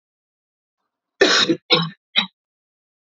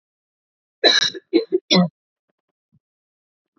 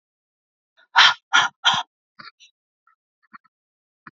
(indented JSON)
{
  "cough_length": "3.2 s",
  "cough_amplitude": 27515,
  "cough_signal_mean_std_ratio": 0.33,
  "three_cough_length": "3.6 s",
  "three_cough_amplitude": 29136,
  "three_cough_signal_mean_std_ratio": 0.32,
  "exhalation_length": "4.2 s",
  "exhalation_amplitude": 28642,
  "exhalation_signal_mean_std_ratio": 0.26,
  "survey_phase": "beta (2021-08-13 to 2022-03-07)",
  "age": "18-44",
  "gender": "Female",
  "wearing_mask": "No",
  "symptom_cough_any": true,
  "symptom_new_continuous_cough": true,
  "symptom_runny_or_blocked_nose": true,
  "symptom_onset": "3 days",
  "smoker_status": "Never smoked",
  "respiratory_condition_asthma": false,
  "respiratory_condition_other": false,
  "recruitment_source": "Test and Trace",
  "submission_delay": "2 days",
  "covid_test_result": "Positive",
  "covid_test_method": "RT-qPCR"
}